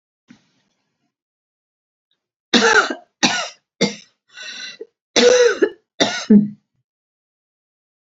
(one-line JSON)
{"cough_length": "8.2 s", "cough_amplitude": 30427, "cough_signal_mean_std_ratio": 0.35, "survey_phase": "beta (2021-08-13 to 2022-03-07)", "age": "65+", "gender": "Female", "wearing_mask": "No", "symptom_none": true, "smoker_status": "Never smoked", "respiratory_condition_asthma": false, "respiratory_condition_other": false, "recruitment_source": "REACT", "submission_delay": "3 days", "covid_test_result": "Negative", "covid_test_method": "RT-qPCR", "influenza_a_test_result": "Negative", "influenza_b_test_result": "Negative"}